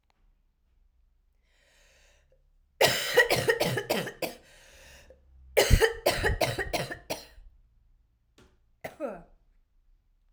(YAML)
cough_length: 10.3 s
cough_amplitude: 19079
cough_signal_mean_std_ratio: 0.37
survey_phase: alpha (2021-03-01 to 2021-08-12)
age: 18-44
gender: Female
wearing_mask: 'No'
symptom_cough_any: true
symptom_shortness_of_breath: true
symptom_fatigue: true
symptom_fever_high_temperature: true
symptom_headache: true
symptom_change_to_sense_of_smell_or_taste: true
symptom_loss_of_taste: true
symptom_onset: 8 days
smoker_status: Ex-smoker
respiratory_condition_asthma: false
respiratory_condition_other: false
recruitment_source: Test and Trace
submission_delay: 1 day
covid_test_result: Positive
covid_test_method: ePCR